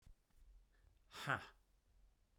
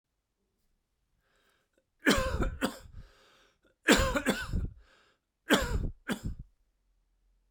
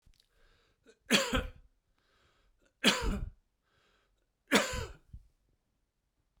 exhalation_length: 2.4 s
exhalation_amplitude: 1962
exhalation_signal_mean_std_ratio: 0.31
cough_length: 7.5 s
cough_amplitude: 15800
cough_signal_mean_std_ratio: 0.39
three_cough_length: 6.4 s
three_cough_amplitude: 12737
three_cough_signal_mean_std_ratio: 0.31
survey_phase: beta (2021-08-13 to 2022-03-07)
age: 45-64
gender: Male
wearing_mask: 'No'
symptom_cough_any: true
symptom_runny_or_blocked_nose: true
symptom_fatigue: true
symptom_fever_high_temperature: true
symptom_headache: true
symptom_onset: 3 days
smoker_status: Never smoked
respiratory_condition_asthma: false
respiratory_condition_other: false
recruitment_source: Test and Trace
submission_delay: 1 day
covid_test_result: Positive
covid_test_method: RT-qPCR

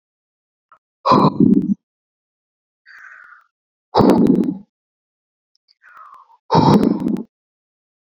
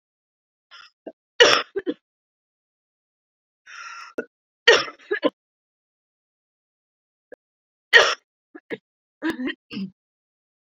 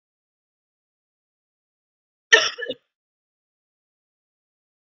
exhalation_length: 8.1 s
exhalation_amplitude: 27986
exhalation_signal_mean_std_ratio: 0.38
three_cough_length: 10.8 s
three_cough_amplitude: 32768
three_cough_signal_mean_std_ratio: 0.23
cough_length: 4.9 s
cough_amplitude: 28979
cough_signal_mean_std_ratio: 0.14
survey_phase: beta (2021-08-13 to 2022-03-07)
age: 18-44
gender: Female
wearing_mask: 'No'
symptom_cough_any: true
symptom_fever_high_temperature: true
symptom_headache: true
smoker_status: Never smoked
respiratory_condition_asthma: false
respiratory_condition_other: false
recruitment_source: Test and Trace
submission_delay: 2 days
covid_test_result: Positive
covid_test_method: RT-qPCR
covid_ct_value: 14.2
covid_ct_gene: ORF1ab gene
covid_ct_mean: 14.4
covid_viral_load: 18000000 copies/ml
covid_viral_load_category: High viral load (>1M copies/ml)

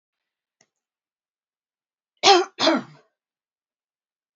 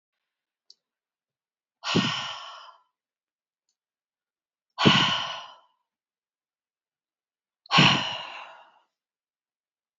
cough_length: 4.4 s
cough_amplitude: 26548
cough_signal_mean_std_ratio: 0.23
exhalation_length: 10.0 s
exhalation_amplitude: 22924
exhalation_signal_mean_std_ratio: 0.28
survey_phase: beta (2021-08-13 to 2022-03-07)
age: 45-64
gender: Female
wearing_mask: 'No'
symptom_none: true
smoker_status: Never smoked
respiratory_condition_asthma: false
respiratory_condition_other: false
recruitment_source: REACT
submission_delay: 2 days
covid_test_result: Negative
covid_test_method: RT-qPCR
influenza_a_test_result: Negative
influenza_b_test_result: Negative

